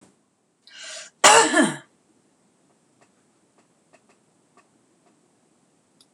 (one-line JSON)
{"cough_length": "6.1 s", "cough_amplitude": 26028, "cough_signal_mean_std_ratio": 0.22, "survey_phase": "beta (2021-08-13 to 2022-03-07)", "age": "65+", "gender": "Female", "wearing_mask": "No", "symptom_none": true, "smoker_status": "Ex-smoker", "respiratory_condition_asthma": false, "respiratory_condition_other": false, "recruitment_source": "REACT", "submission_delay": "0 days", "covid_test_result": "Negative", "covid_test_method": "RT-qPCR", "influenza_a_test_result": "Negative", "influenza_b_test_result": "Negative"}